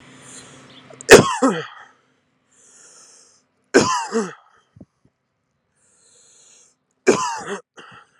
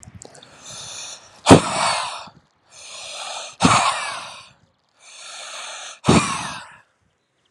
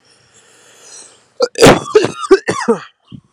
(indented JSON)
{
  "three_cough_length": "8.2 s",
  "three_cough_amplitude": 32768,
  "three_cough_signal_mean_std_ratio": 0.26,
  "exhalation_length": "7.5 s",
  "exhalation_amplitude": 32768,
  "exhalation_signal_mean_std_ratio": 0.37,
  "cough_length": "3.3 s",
  "cough_amplitude": 32768,
  "cough_signal_mean_std_ratio": 0.39,
  "survey_phase": "alpha (2021-03-01 to 2021-08-12)",
  "age": "18-44",
  "gender": "Male",
  "wearing_mask": "No",
  "symptom_cough_any": true,
  "symptom_new_continuous_cough": true,
  "symptom_shortness_of_breath": true,
  "symptom_fatigue": true,
  "symptom_fever_high_temperature": true,
  "symptom_change_to_sense_of_smell_or_taste": true,
  "symptom_onset": "4 days",
  "smoker_status": "Current smoker (1 to 10 cigarettes per day)",
  "respiratory_condition_asthma": true,
  "respiratory_condition_other": false,
  "recruitment_source": "Test and Trace",
  "submission_delay": "2 days",
  "covid_test_result": "Positive",
  "covid_test_method": "RT-qPCR",
  "covid_ct_value": 14.0,
  "covid_ct_gene": "ORF1ab gene",
  "covid_ct_mean": 14.0,
  "covid_viral_load": "26000000 copies/ml",
  "covid_viral_load_category": "High viral load (>1M copies/ml)"
}